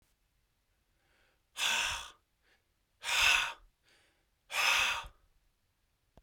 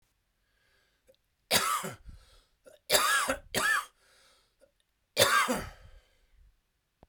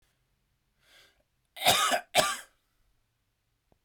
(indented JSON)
{
  "exhalation_length": "6.2 s",
  "exhalation_amplitude": 7316,
  "exhalation_signal_mean_std_ratio": 0.39,
  "three_cough_length": "7.1 s",
  "three_cough_amplitude": 13367,
  "three_cough_signal_mean_std_ratio": 0.39,
  "cough_length": "3.8 s",
  "cough_amplitude": 12260,
  "cough_signal_mean_std_ratio": 0.31,
  "survey_phase": "beta (2021-08-13 to 2022-03-07)",
  "age": "45-64",
  "gender": "Male",
  "wearing_mask": "No",
  "symptom_cough_any": true,
  "symptom_runny_or_blocked_nose": true,
  "symptom_shortness_of_breath": true,
  "symptom_fatigue": true,
  "symptom_other": true,
  "symptom_onset": "3 days",
  "smoker_status": "Ex-smoker",
  "respiratory_condition_asthma": false,
  "respiratory_condition_other": false,
  "recruitment_source": "Test and Trace",
  "submission_delay": "2 days",
  "covid_test_result": "Positive",
  "covid_test_method": "RT-qPCR",
  "covid_ct_value": 28.0,
  "covid_ct_gene": "ORF1ab gene"
}